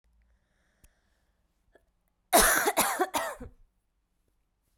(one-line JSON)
{"cough_length": "4.8 s", "cough_amplitude": 14959, "cough_signal_mean_std_ratio": 0.32, "survey_phase": "beta (2021-08-13 to 2022-03-07)", "age": "18-44", "gender": "Female", "wearing_mask": "No", "symptom_cough_any": true, "symptom_runny_or_blocked_nose": true, "symptom_headache": true, "symptom_change_to_sense_of_smell_or_taste": true, "symptom_loss_of_taste": true, "smoker_status": "Never smoked", "respiratory_condition_asthma": true, "respiratory_condition_other": false, "recruitment_source": "Test and Trace", "submission_delay": "2 days", "covid_test_result": "Positive", "covid_test_method": "LAMP"}